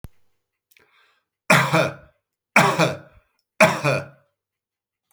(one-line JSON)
{"three_cough_length": "5.1 s", "three_cough_amplitude": 31562, "three_cough_signal_mean_std_ratio": 0.36, "survey_phase": "beta (2021-08-13 to 2022-03-07)", "age": "45-64", "gender": "Male", "wearing_mask": "No", "symptom_none": true, "smoker_status": "Never smoked", "respiratory_condition_asthma": false, "respiratory_condition_other": false, "recruitment_source": "REACT", "submission_delay": "1 day", "covid_test_result": "Negative", "covid_test_method": "RT-qPCR"}